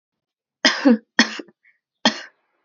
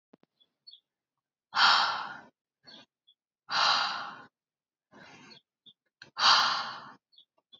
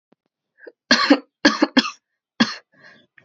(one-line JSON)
{"three_cough_length": "2.6 s", "three_cough_amplitude": 29998, "three_cough_signal_mean_std_ratio": 0.32, "exhalation_length": "7.6 s", "exhalation_amplitude": 11684, "exhalation_signal_mean_std_ratio": 0.36, "cough_length": "3.2 s", "cough_amplitude": 29958, "cough_signal_mean_std_ratio": 0.32, "survey_phase": "alpha (2021-03-01 to 2021-08-12)", "age": "18-44", "gender": "Female", "wearing_mask": "No", "symptom_cough_any": true, "symptom_fever_high_temperature": true, "symptom_headache": true, "symptom_loss_of_taste": true, "symptom_onset": "3 days", "smoker_status": "Never smoked", "respiratory_condition_asthma": false, "respiratory_condition_other": false, "recruitment_source": "Test and Trace", "submission_delay": "2 days", "covid_test_result": "Positive", "covid_test_method": "RT-qPCR", "covid_ct_value": 20.5, "covid_ct_gene": "ORF1ab gene"}